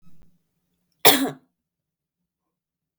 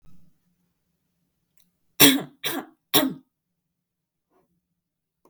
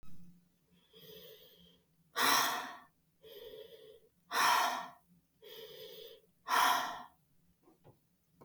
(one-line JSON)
{"cough_length": "3.0 s", "cough_amplitude": 32768, "cough_signal_mean_std_ratio": 0.21, "three_cough_length": "5.3 s", "three_cough_amplitude": 32768, "three_cough_signal_mean_std_ratio": 0.22, "exhalation_length": "8.4 s", "exhalation_amplitude": 5710, "exhalation_signal_mean_std_ratio": 0.4, "survey_phase": "beta (2021-08-13 to 2022-03-07)", "age": "18-44", "gender": "Female", "wearing_mask": "No", "symptom_none": true, "smoker_status": "Never smoked", "respiratory_condition_asthma": false, "respiratory_condition_other": false, "recruitment_source": "REACT", "submission_delay": "1 day", "covid_test_result": "Negative", "covid_test_method": "RT-qPCR", "influenza_a_test_result": "Negative", "influenza_b_test_result": "Negative"}